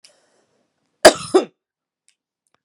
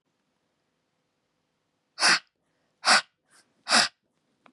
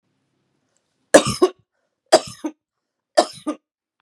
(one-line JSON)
{"cough_length": "2.6 s", "cough_amplitude": 32768, "cough_signal_mean_std_ratio": 0.19, "exhalation_length": "4.5 s", "exhalation_amplitude": 18644, "exhalation_signal_mean_std_ratio": 0.27, "three_cough_length": "4.0 s", "three_cough_amplitude": 32768, "three_cough_signal_mean_std_ratio": 0.24, "survey_phase": "beta (2021-08-13 to 2022-03-07)", "age": "45-64", "gender": "Female", "wearing_mask": "No", "symptom_runny_or_blocked_nose": true, "symptom_change_to_sense_of_smell_or_taste": true, "symptom_other": true, "smoker_status": "Current smoker (1 to 10 cigarettes per day)", "respiratory_condition_asthma": false, "respiratory_condition_other": false, "recruitment_source": "Test and Trace", "submission_delay": "2 days", "covid_test_result": "Positive", "covid_test_method": "LFT"}